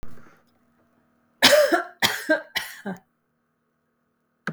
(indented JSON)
{
  "three_cough_length": "4.5 s",
  "three_cough_amplitude": 32768,
  "three_cough_signal_mean_std_ratio": 0.35,
  "survey_phase": "beta (2021-08-13 to 2022-03-07)",
  "age": "45-64",
  "gender": "Female",
  "wearing_mask": "No",
  "symptom_none": true,
  "smoker_status": "Ex-smoker",
  "respiratory_condition_asthma": false,
  "respiratory_condition_other": false,
  "recruitment_source": "REACT",
  "submission_delay": "1 day",
  "covid_test_result": "Negative",
  "covid_test_method": "RT-qPCR",
  "influenza_a_test_result": "Unknown/Void",
  "influenza_b_test_result": "Unknown/Void"
}